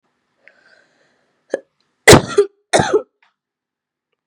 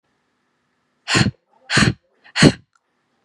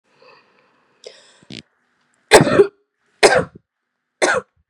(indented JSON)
{
  "cough_length": "4.3 s",
  "cough_amplitude": 32768,
  "cough_signal_mean_std_ratio": 0.25,
  "exhalation_length": "3.2 s",
  "exhalation_amplitude": 32768,
  "exhalation_signal_mean_std_ratio": 0.32,
  "three_cough_length": "4.7 s",
  "three_cough_amplitude": 32768,
  "three_cough_signal_mean_std_ratio": 0.29,
  "survey_phase": "beta (2021-08-13 to 2022-03-07)",
  "age": "18-44",
  "gender": "Female",
  "wearing_mask": "No",
  "symptom_none": true,
  "symptom_onset": "8 days",
  "smoker_status": "Never smoked",
  "respiratory_condition_asthma": false,
  "respiratory_condition_other": false,
  "recruitment_source": "REACT",
  "submission_delay": "1 day",
  "covid_test_result": "Negative",
  "covid_test_method": "RT-qPCR",
  "influenza_a_test_result": "Negative",
  "influenza_b_test_result": "Negative"
}